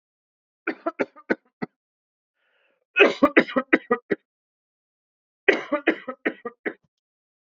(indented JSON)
{
  "three_cough_length": "7.5 s",
  "three_cough_amplitude": 27376,
  "three_cough_signal_mean_std_ratio": 0.27,
  "survey_phase": "beta (2021-08-13 to 2022-03-07)",
  "age": "18-44",
  "gender": "Male",
  "wearing_mask": "No",
  "symptom_sore_throat": true,
  "symptom_onset": "13 days",
  "smoker_status": "Ex-smoker",
  "respiratory_condition_asthma": true,
  "respiratory_condition_other": false,
  "recruitment_source": "REACT",
  "submission_delay": "3 days",
  "covid_test_result": "Negative",
  "covid_test_method": "RT-qPCR",
  "influenza_a_test_result": "Negative",
  "influenza_b_test_result": "Negative"
}